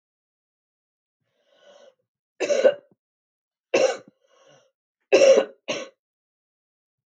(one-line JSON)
{"three_cough_length": "7.2 s", "three_cough_amplitude": 22042, "three_cough_signal_mean_std_ratio": 0.27, "survey_phase": "beta (2021-08-13 to 2022-03-07)", "age": "45-64", "gender": "Female", "wearing_mask": "No", "symptom_cough_any": true, "symptom_new_continuous_cough": true, "symptom_sore_throat": true, "symptom_fatigue": true, "symptom_fever_high_temperature": true, "symptom_headache": true, "symptom_onset": "2 days", "smoker_status": "Never smoked", "respiratory_condition_asthma": false, "respiratory_condition_other": false, "recruitment_source": "Test and Trace", "submission_delay": "2 days", "covid_test_result": "Positive", "covid_test_method": "RT-qPCR", "covid_ct_value": 31.5, "covid_ct_gene": "ORF1ab gene"}